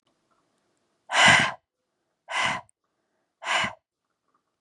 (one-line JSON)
{"exhalation_length": "4.6 s", "exhalation_amplitude": 21292, "exhalation_signal_mean_std_ratio": 0.32, "survey_phase": "beta (2021-08-13 to 2022-03-07)", "age": "18-44", "gender": "Female", "wearing_mask": "No", "symptom_none": true, "smoker_status": "Prefer not to say", "respiratory_condition_asthma": false, "respiratory_condition_other": false, "recruitment_source": "REACT", "submission_delay": "1 day", "covid_test_result": "Negative", "covid_test_method": "RT-qPCR"}